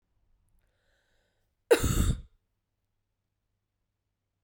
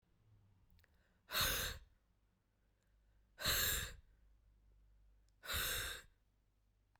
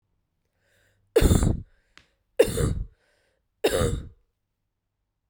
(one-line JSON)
{"cough_length": "4.4 s", "cough_amplitude": 13167, "cough_signal_mean_std_ratio": 0.24, "exhalation_length": "7.0 s", "exhalation_amplitude": 2168, "exhalation_signal_mean_std_ratio": 0.4, "three_cough_length": "5.3 s", "three_cough_amplitude": 18437, "three_cough_signal_mean_std_ratio": 0.35, "survey_phase": "beta (2021-08-13 to 2022-03-07)", "age": "18-44", "gender": "Female", "wearing_mask": "No", "symptom_cough_any": true, "symptom_runny_or_blocked_nose": true, "symptom_fatigue": true, "symptom_fever_high_temperature": true, "symptom_headache": true, "symptom_change_to_sense_of_smell_or_taste": true, "symptom_loss_of_taste": true, "smoker_status": "Never smoked", "respiratory_condition_asthma": false, "respiratory_condition_other": false, "recruitment_source": "Test and Trace", "submission_delay": "2 days", "covid_test_result": "Positive", "covid_test_method": "RT-qPCR", "covid_ct_value": 19.1, "covid_ct_gene": "ORF1ab gene", "covid_ct_mean": 19.6, "covid_viral_load": "370000 copies/ml", "covid_viral_load_category": "Low viral load (10K-1M copies/ml)"}